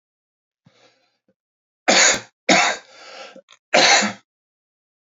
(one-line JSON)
{"three_cough_length": "5.1 s", "three_cough_amplitude": 31358, "three_cough_signal_mean_std_ratio": 0.36, "survey_phase": "beta (2021-08-13 to 2022-03-07)", "age": "45-64", "gender": "Male", "wearing_mask": "No", "symptom_cough_any": true, "symptom_runny_or_blocked_nose": true, "symptom_fever_high_temperature": true, "symptom_change_to_sense_of_smell_or_taste": true, "symptom_loss_of_taste": true, "symptom_other": true, "symptom_onset": "3 days", "smoker_status": "Never smoked", "respiratory_condition_asthma": false, "respiratory_condition_other": false, "recruitment_source": "Test and Trace", "submission_delay": "1 day", "covid_test_result": "Positive", "covid_test_method": "RT-qPCR", "covid_ct_value": 15.4, "covid_ct_gene": "ORF1ab gene", "covid_ct_mean": 15.9, "covid_viral_load": "6300000 copies/ml", "covid_viral_load_category": "High viral load (>1M copies/ml)"}